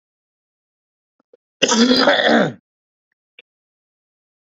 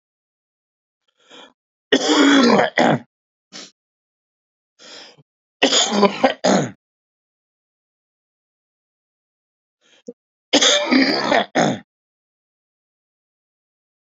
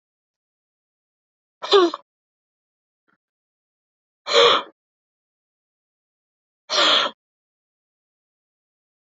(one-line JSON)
{"cough_length": "4.4 s", "cough_amplitude": 32101, "cough_signal_mean_std_ratio": 0.35, "three_cough_length": "14.2 s", "three_cough_amplitude": 28457, "three_cough_signal_mean_std_ratio": 0.36, "exhalation_length": "9.0 s", "exhalation_amplitude": 25390, "exhalation_signal_mean_std_ratio": 0.25, "survey_phase": "beta (2021-08-13 to 2022-03-07)", "age": "45-64", "gender": "Male", "wearing_mask": "No", "symptom_runny_or_blocked_nose": true, "symptom_onset": "3 days", "smoker_status": "Never smoked", "respiratory_condition_asthma": true, "respiratory_condition_other": false, "recruitment_source": "Test and Trace", "submission_delay": "1 day", "covid_test_result": "Positive", "covid_test_method": "RT-qPCR", "covid_ct_value": 18.6, "covid_ct_gene": "N gene"}